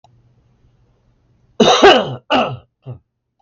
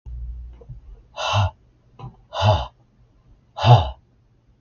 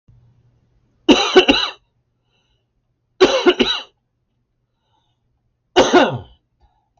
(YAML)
cough_length: 3.4 s
cough_amplitude: 32768
cough_signal_mean_std_ratio: 0.37
exhalation_length: 4.6 s
exhalation_amplitude: 31918
exhalation_signal_mean_std_ratio: 0.37
three_cough_length: 7.0 s
three_cough_amplitude: 32768
three_cough_signal_mean_std_ratio: 0.34
survey_phase: beta (2021-08-13 to 2022-03-07)
age: 18-44
gender: Male
wearing_mask: 'No'
symptom_cough_any: true
symptom_new_continuous_cough: true
symptom_runny_or_blocked_nose: true
symptom_sore_throat: true
symptom_fatigue: true
symptom_other: true
smoker_status: Never smoked
respiratory_condition_asthma: false
respiratory_condition_other: false
recruitment_source: Test and Trace
submission_delay: 1 day
covid_test_result: Positive
covid_test_method: LFT